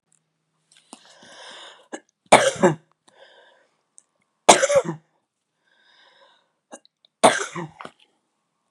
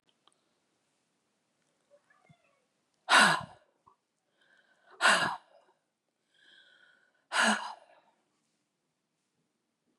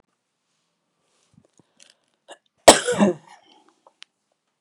{"three_cough_length": "8.7 s", "three_cough_amplitude": 32768, "three_cough_signal_mean_std_ratio": 0.24, "exhalation_length": "10.0 s", "exhalation_amplitude": 14385, "exhalation_signal_mean_std_ratio": 0.24, "cough_length": "4.6 s", "cough_amplitude": 32768, "cough_signal_mean_std_ratio": 0.18, "survey_phase": "beta (2021-08-13 to 2022-03-07)", "age": "65+", "gender": "Female", "wearing_mask": "No", "symptom_cough_any": true, "symptom_runny_or_blocked_nose": true, "symptom_fatigue": true, "smoker_status": "Never smoked", "respiratory_condition_asthma": true, "respiratory_condition_other": false, "recruitment_source": "REACT", "submission_delay": "1 day", "covid_test_result": "Negative", "covid_test_method": "RT-qPCR"}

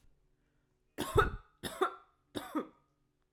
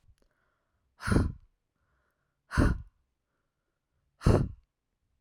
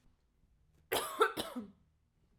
{"three_cough_length": "3.3 s", "three_cough_amplitude": 6540, "three_cough_signal_mean_std_ratio": 0.33, "exhalation_length": "5.2 s", "exhalation_amplitude": 10312, "exhalation_signal_mean_std_ratio": 0.29, "cough_length": "2.4 s", "cough_amplitude": 5878, "cough_signal_mean_std_ratio": 0.34, "survey_phase": "alpha (2021-03-01 to 2021-08-12)", "age": "18-44", "gender": "Female", "wearing_mask": "No", "symptom_cough_any": true, "symptom_fatigue": true, "smoker_status": "Never smoked", "respiratory_condition_asthma": false, "respiratory_condition_other": false, "recruitment_source": "Test and Trace", "submission_delay": "1 day", "covid_test_result": "Positive", "covid_test_method": "RT-qPCR", "covid_ct_value": 31.2, "covid_ct_gene": "ORF1ab gene", "covid_ct_mean": 32.5, "covid_viral_load": "22 copies/ml", "covid_viral_load_category": "Minimal viral load (< 10K copies/ml)"}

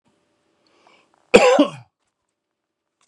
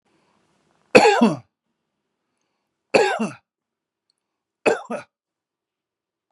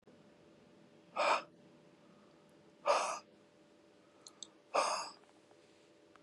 {"cough_length": "3.1 s", "cough_amplitude": 32768, "cough_signal_mean_std_ratio": 0.26, "three_cough_length": "6.3 s", "three_cough_amplitude": 32768, "three_cough_signal_mean_std_ratio": 0.27, "exhalation_length": "6.2 s", "exhalation_amplitude": 3994, "exhalation_signal_mean_std_ratio": 0.35, "survey_phase": "beta (2021-08-13 to 2022-03-07)", "age": "45-64", "gender": "Male", "wearing_mask": "No", "symptom_none": true, "smoker_status": "Current smoker (1 to 10 cigarettes per day)", "respiratory_condition_asthma": false, "respiratory_condition_other": false, "recruitment_source": "REACT", "submission_delay": "1 day", "covid_test_result": "Negative", "covid_test_method": "RT-qPCR", "influenza_a_test_result": "Negative", "influenza_b_test_result": "Negative"}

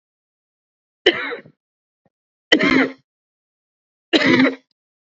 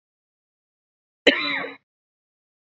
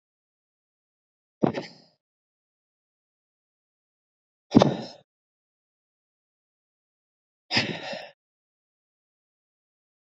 {"three_cough_length": "5.1 s", "three_cough_amplitude": 29225, "three_cough_signal_mean_std_ratio": 0.34, "cough_length": "2.7 s", "cough_amplitude": 28390, "cough_signal_mean_std_ratio": 0.24, "exhalation_length": "10.2 s", "exhalation_amplitude": 27779, "exhalation_signal_mean_std_ratio": 0.17, "survey_phase": "beta (2021-08-13 to 2022-03-07)", "age": "18-44", "gender": "Male", "wearing_mask": "No", "symptom_runny_or_blocked_nose": true, "symptom_abdominal_pain": true, "symptom_diarrhoea": true, "symptom_fatigue": true, "symptom_change_to_sense_of_smell_or_taste": true, "smoker_status": "Never smoked", "respiratory_condition_asthma": false, "respiratory_condition_other": false, "recruitment_source": "Test and Trace", "submission_delay": "2 days", "covid_test_result": "Positive", "covid_test_method": "LFT"}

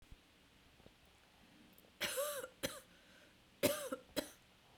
{"cough_length": "4.8 s", "cough_amplitude": 5105, "cough_signal_mean_std_ratio": 0.37, "survey_phase": "beta (2021-08-13 to 2022-03-07)", "age": "45-64", "gender": "Female", "wearing_mask": "Yes", "symptom_cough_any": true, "symptom_new_continuous_cough": true, "symptom_shortness_of_breath": true, "symptom_abdominal_pain": true, "symptom_fatigue": true, "symptom_fever_high_temperature": true, "symptom_headache": true, "symptom_change_to_sense_of_smell_or_taste": true, "symptom_onset": "2 days", "smoker_status": "Ex-smoker", "respiratory_condition_asthma": false, "respiratory_condition_other": false, "recruitment_source": "Test and Trace", "submission_delay": "2 days", "covid_test_result": "Positive", "covid_test_method": "RT-qPCR", "covid_ct_value": 26.3, "covid_ct_gene": "ORF1ab gene", "covid_ct_mean": 26.7, "covid_viral_load": "1700 copies/ml", "covid_viral_load_category": "Minimal viral load (< 10K copies/ml)"}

